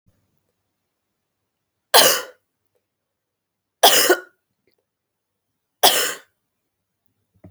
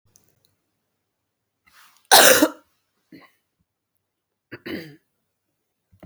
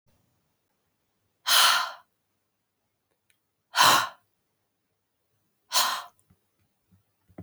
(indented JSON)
{
  "three_cough_length": "7.5 s",
  "three_cough_amplitude": 32768,
  "three_cough_signal_mean_std_ratio": 0.26,
  "cough_length": "6.1 s",
  "cough_amplitude": 32768,
  "cough_signal_mean_std_ratio": 0.21,
  "exhalation_length": "7.4 s",
  "exhalation_amplitude": 16233,
  "exhalation_signal_mean_std_ratio": 0.28,
  "survey_phase": "beta (2021-08-13 to 2022-03-07)",
  "age": "45-64",
  "gender": "Female",
  "wearing_mask": "No",
  "symptom_fatigue": true,
  "symptom_fever_high_temperature": true,
  "symptom_change_to_sense_of_smell_or_taste": true,
  "symptom_loss_of_taste": true,
  "symptom_onset": "3 days",
  "smoker_status": "Never smoked",
  "respiratory_condition_asthma": false,
  "respiratory_condition_other": false,
  "recruitment_source": "Test and Trace",
  "submission_delay": "2 days",
  "covid_test_result": "Positive",
  "covid_test_method": "RT-qPCR",
  "covid_ct_value": 17.1,
  "covid_ct_gene": "ORF1ab gene",
  "covid_ct_mean": 18.4,
  "covid_viral_load": "900000 copies/ml",
  "covid_viral_load_category": "Low viral load (10K-1M copies/ml)"
}